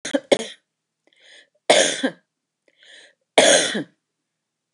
{"three_cough_length": "4.7 s", "three_cough_amplitude": 28564, "three_cough_signal_mean_std_ratio": 0.34, "survey_phase": "beta (2021-08-13 to 2022-03-07)", "age": "65+", "gender": "Female", "wearing_mask": "No", "symptom_none": true, "symptom_onset": "12 days", "smoker_status": "Ex-smoker", "respiratory_condition_asthma": false, "respiratory_condition_other": false, "recruitment_source": "REACT", "submission_delay": "4 days", "covid_test_result": "Negative", "covid_test_method": "RT-qPCR", "influenza_a_test_result": "Negative", "influenza_b_test_result": "Negative"}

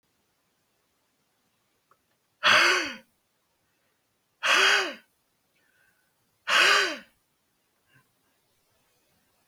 {"exhalation_length": "9.5 s", "exhalation_amplitude": 13889, "exhalation_signal_mean_std_ratio": 0.31, "survey_phase": "beta (2021-08-13 to 2022-03-07)", "age": "45-64", "gender": "Male", "wearing_mask": "No", "symptom_change_to_sense_of_smell_or_taste": true, "symptom_loss_of_taste": true, "smoker_status": "Never smoked", "respiratory_condition_asthma": false, "respiratory_condition_other": false, "recruitment_source": "Test and Trace", "submission_delay": "2 days", "covid_test_result": "Positive", "covid_test_method": "RT-qPCR", "covid_ct_value": 16.5, "covid_ct_gene": "ORF1ab gene"}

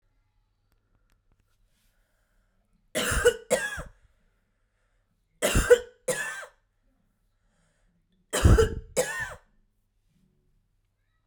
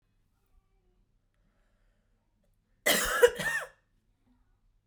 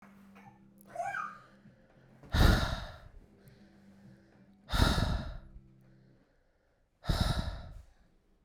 {"three_cough_length": "11.3 s", "three_cough_amplitude": 19127, "three_cough_signal_mean_std_ratio": 0.29, "cough_length": "4.9 s", "cough_amplitude": 12716, "cough_signal_mean_std_ratio": 0.26, "exhalation_length": "8.4 s", "exhalation_amplitude": 8777, "exhalation_signal_mean_std_ratio": 0.38, "survey_phase": "beta (2021-08-13 to 2022-03-07)", "age": "18-44", "gender": "Female", "wearing_mask": "No", "symptom_cough_any": true, "symptom_runny_or_blocked_nose": true, "symptom_shortness_of_breath": true, "symptom_sore_throat": true, "symptom_fatigue": true, "symptom_headache": true, "symptom_change_to_sense_of_smell_or_taste": true, "symptom_onset": "3 days", "smoker_status": "Current smoker (11 or more cigarettes per day)", "respiratory_condition_asthma": false, "respiratory_condition_other": false, "recruitment_source": "Test and Trace", "submission_delay": "2 days", "covid_test_result": "Positive", "covid_test_method": "RT-qPCR", "covid_ct_value": 20.6, "covid_ct_gene": "ORF1ab gene", "covid_ct_mean": 21.6, "covid_viral_load": "84000 copies/ml", "covid_viral_load_category": "Low viral load (10K-1M copies/ml)"}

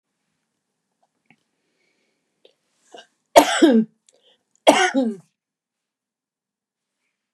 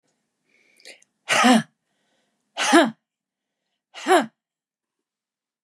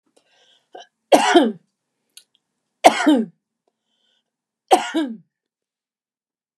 {"cough_length": "7.3 s", "cough_amplitude": 32768, "cough_signal_mean_std_ratio": 0.25, "exhalation_length": "5.6 s", "exhalation_amplitude": 28490, "exhalation_signal_mean_std_ratio": 0.29, "three_cough_length": "6.6 s", "three_cough_amplitude": 32768, "three_cough_signal_mean_std_ratio": 0.29, "survey_phase": "beta (2021-08-13 to 2022-03-07)", "age": "65+", "gender": "Female", "wearing_mask": "No", "symptom_runny_or_blocked_nose": true, "smoker_status": "Never smoked", "respiratory_condition_asthma": false, "respiratory_condition_other": false, "recruitment_source": "REACT", "submission_delay": "2 days", "covid_test_result": "Negative", "covid_test_method": "RT-qPCR", "influenza_a_test_result": "Unknown/Void", "influenza_b_test_result": "Unknown/Void"}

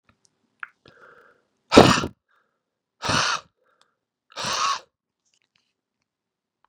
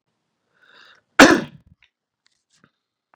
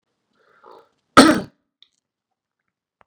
{"exhalation_length": "6.7 s", "exhalation_amplitude": 32768, "exhalation_signal_mean_std_ratio": 0.24, "three_cough_length": "3.2 s", "three_cough_amplitude": 32768, "three_cough_signal_mean_std_ratio": 0.19, "cough_length": "3.1 s", "cough_amplitude": 32768, "cough_signal_mean_std_ratio": 0.2, "survey_phase": "beta (2021-08-13 to 2022-03-07)", "age": "18-44", "gender": "Male", "wearing_mask": "No", "symptom_none": true, "smoker_status": "Never smoked", "respiratory_condition_asthma": false, "respiratory_condition_other": false, "recruitment_source": "REACT", "submission_delay": "1 day", "covid_test_result": "Negative", "covid_test_method": "RT-qPCR", "influenza_a_test_result": "Negative", "influenza_b_test_result": "Negative"}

